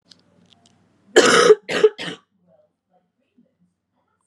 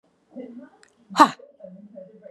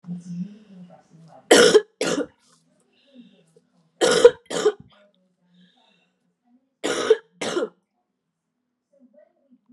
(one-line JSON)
{"cough_length": "4.3 s", "cough_amplitude": 32768, "cough_signal_mean_std_ratio": 0.29, "exhalation_length": "2.3 s", "exhalation_amplitude": 32609, "exhalation_signal_mean_std_ratio": 0.22, "three_cough_length": "9.7 s", "three_cough_amplitude": 32768, "three_cough_signal_mean_std_ratio": 0.29, "survey_phase": "beta (2021-08-13 to 2022-03-07)", "age": "18-44", "gender": "Female", "wearing_mask": "No", "symptom_cough_any": true, "symptom_new_continuous_cough": true, "symptom_runny_or_blocked_nose": true, "symptom_fatigue": true, "symptom_fever_high_temperature": true, "symptom_headache": true, "smoker_status": "Never smoked", "respiratory_condition_asthma": false, "respiratory_condition_other": false, "recruitment_source": "Test and Trace", "submission_delay": "2 days", "covid_test_result": "Positive", "covid_test_method": "RT-qPCR"}